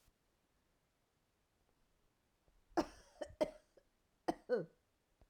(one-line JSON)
{"cough_length": "5.3 s", "cough_amplitude": 2511, "cough_signal_mean_std_ratio": 0.23, "survey_phase": "alpha (2021-03-01 to 2021-08-12)", "age": "45-64", "gender": "Female", "wearing_mask": "No", "symptom_headache": true, "symptom_onset": "4 days", "smoker_status": "Never smoked", "respiratory_condition_asthma": false, "respiratory_condition_other": false, "recruitment_source": "REACT", "submission_delay": "3 days", "covid_test_result": "Negative", "covid_test_method": "RT-qPCR"}